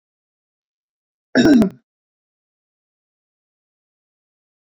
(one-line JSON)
{"cough_length": "4.6 s", "cough_amplitude": 25312, "cough_signal_mean_std_ratio": 0.22, "survey_phase": "beta (2021-08-13 to 2022-03-07)", "age": "65+", "gender": "Male", "wearing_mask": "No", "symptom_none": true, "smoker_status": "Never smoked", "respiratory_condition_asthma": false, "respiratory_condition_other": false, "recruitment_source": "REACT", "submission_delay": "1 day", "covid_test_result": "Negative", "covid_test_method": "RT-qPCR"}